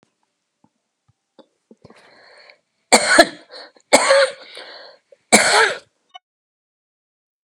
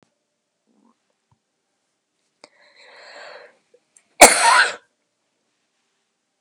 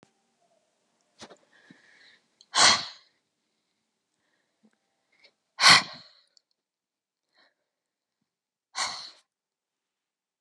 {"three_cough_length": "7.4 s", "three_cough_amplitude": 32768, "three_cough_signal_mean_std_ratio": 0.31, "cough_length": "6.4 s", "cough_amplitude": 32768, "cough_signal_mean_std_ratio": 0.2, "exhalation_length": "10.4 s", "exhalation_amplitude": 25231, "exhalation_signal_mean_std_ratio": 0.18, "survey_phase": "beta (2021-08-13 to 2022-03-07)", "age": "65+", "gender": "Female", "wearing_mask": "No", "symptom_cough_any": true, "symptom_sore_throat": true, "symptom_onset": "9 days", "smoker_status": "Ex-smoker", "respiratory_condition_asthma": false, "respiratory_condition_other": false, "recruitment_source": "REACT", "submission_delay": "2 days", "covid_test_result": "Negative", "covid_test_method": "RT-qPCR", "influenza_a_test_result": "Unknown/Void", "influenza_b_test_result": "Unknown/Void"}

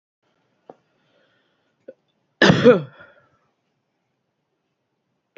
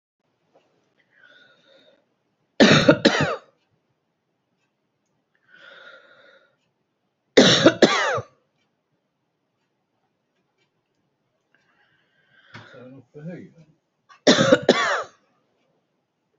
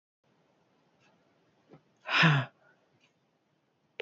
{"cough_length": "5.4 s", "cough_amplitude": 27820, "cough_signal_mean_std_ratio": 0.2, "three_cough_length": "16.4 s", "three_cough_amplitude": 31047, "three_cough_signal_mean_std_ratio": 0.26, "exhalation_length": "4.0 s", "exhalation_amplitude": 8747, "exhalation_signal_mean_std_ratio": 0.25, "survey_phase": "beta (2021-08-13 to 2022-03-07)", "age": "45-64", "gender": "Female", "wearing_mask": "No", "symptom_cough_any": true, "symptom_runny_or_blocked_nose": true, "symptom_shortness_of_breath": true, "symptom_fatigue": true, "symptom_headache": true, "symptom_change_to_sense_of_smell_or_taste": true, "symptom_loss_of_taste": true, "symptom_onset": "12 days", "smoker_status": "Ex-smoker", "respiratory_condition_asthma": false, "respiratory_condition_other": false, "recruitment_source": "REACT", "submission_delay": "2 days", "covid_test_result": "Negative", "covid_test_method": "RT-qPCR", "influenza_a_test_result": "Negative", "influenza_b_test_result": "Negative"}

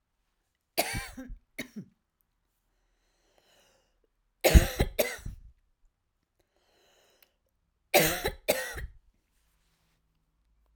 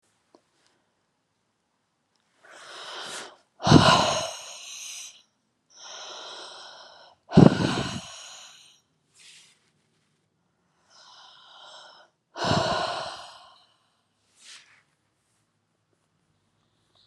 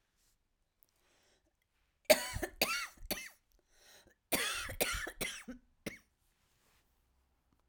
{"three_cough_length": "10.8 s", "three_cough_amplitude": 22998, "three_cough_signal_mean_std_ratio": 0.24, "exhalation_length": "17.1 s", "exhalation_amplitude": 32329, "exhalation_signal_mean_std_ratio": 0.25, "cough_length": "7.7 s", "cough_amplitude": 9036, "cough_signal_mean_std_ratio": 0.31, "survey_phase": "alpha (2021-03-01 to 2021-08-12)", "age": "45-64", "gender": "Female", "wearing_mask": "No", "symptom_none": true, "symptom_onset": "8 days", "smoker_status": "Never smoked", "respiratory_condition_asthma": false, "respiratory_condition_other": false, "recruitment_source": "REACT", "submission_delay": "2 days", "covid_test_result": "Negative", "covid_test_method": "RT-qPCR"}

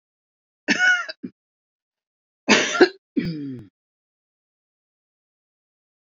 {"cough_length": "6.1 s", "cough_amplitude": 27116, "cough_signal_mean_std_ratio": 0.3, "survey_phase": "alpha (2021-03-01 to 2021-08-12)", "age": "45-64", "gender": "Female", "wearing_mask": "No", "symptom_none": true, "smoker_status": "Ex-smoker", "respiratory_condition_asthma": false, "respiratory_condition_other": false, "recruitment_source": "REACT", "submission_delay": "2 days", "covid_test_result": "Negative", "covid_test_method": "RT-qPCR"}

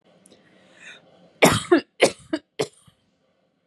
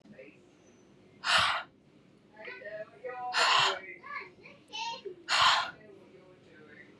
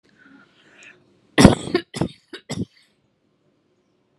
{"three_cough_length": "3.7 s", "three_cough_amplitude": 25798, "three_cough_signal_mean_std_ratio": 0.28, "exhalation_length": "7.0 s", "exhalation_amplitude": 8547, "exhalation_signal_mean_std_ratio": 0.45, "cough_length": "4.2 s", "cough_amplitude": 32768, "cough_signal_mean_std_ratio": 0.22, "survey_phase": "alpha (2021-03-01 to 2021-08-12)", "age": "18-44", "gender": "Female", "wearing_mask": "No", "symptom_none": true, "smoker_status": "Ex-smoker", "respiratory_condition_asthma": false, "respiratory_condition_other": false, "recruitment_source": "REACT", "submission_delay": "1 day", "covid_test_result": "Negative", "covid_test_method": "RT-qPCR"}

